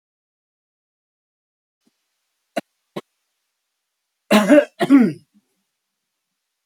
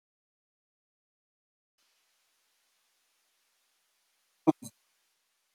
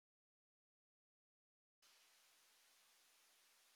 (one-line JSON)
{"three_cough_length": "6.7 s", "three_cough_amplitude": 28131, "three_cough_signal_mean_std_ratio": 0.24, "exhalation_length": "5.5 s", "exhalation_amplitude": 10744, "exhalation_signal_mean_std_ratio": 0.08, "cough_length": "3.8 s", "cough_amplitude": 32, "cough_signal_mean_std_ratio": 0.66, "survey_phase": "beta (2021-08-13 to 2022-03-07)", "age": "65+", "gender": "Male", "wearing_mask": "No", "symptom_none": true, "smoker_status": "Never smoked", "respiratory_condition_asthma": false, "respiratory_condition_other": false, "recruitment_source": "REACT", "submission_delay": "1 day", "covid_test_result": "Negative", "covid_test_method": "RT-qPCR", "influenza_a_test_result": "Negative", "influenza_b_test_result": "Negative"}